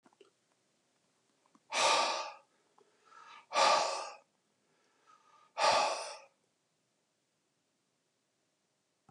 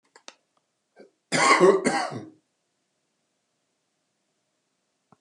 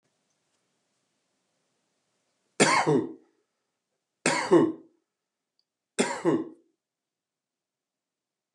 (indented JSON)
{
  "exhalation_length": "9.1 s",
  "exhalation_amplitude": 7441,
  "exhalation_signal_mean_std_ratio": 0.33,
  "cough_length": "5.2 s",
  "cough_amplitude": 19156,
  "cough_signal_mean_std_ratio": 0.29,
  "three_cough_length": "8.5 s",
  "three_cough_amplitude": 17751,
  "three_cough_signal_mean_std_ratio": 0.3,
  "survey_phase": "beta (2021-08-13 to 2022-03-07)",
  "age": "65+",
  "gender": "Male",
  "wearing_mask": "No",
  "symptom_none": true,
  "smoker_status": "Ex-smoker",
  "respiratory_condition_asthma": false,
  "respiratory_condition_other": false,
  "recruitment_source": "REACT",
  "submission_delay": "2 days",
  "covid_test_result": "Negative",
  "covid_test_method": "RT-qPCR"
}